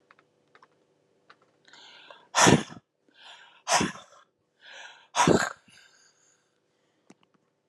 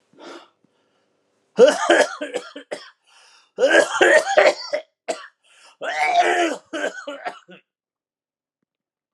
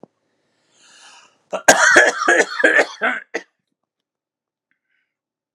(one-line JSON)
{"exhalation_length": "7.7 s", "exhalation_amplitude": 20397, "exhalation_signal_mean_std_ratio": 0.26, "three_cough_length": "9.1 s", "three_cough_amplitude": 29759, "three_cough_signal_mean_std_ratio": 0.41, "cough_length": "5.5 s", "cough_amplitude": 32768, "cough_signal_mean_std_ratio": 0.36, "survey_phase": "alpha (2021-03-01 to 2021-08-12)", "age": "45-64", "gender": "Male", "wearing_mask": "No", "symptom_none": true, "smoker_status": "Never smoked", "respiratory_condition_asthma": false, "respiratory_condition_other": false, "recruitment_source": "REACT", "submission_delay": "2 days", "covid_test_result": "Negative", "covid_test_method": "RT-qPCR"}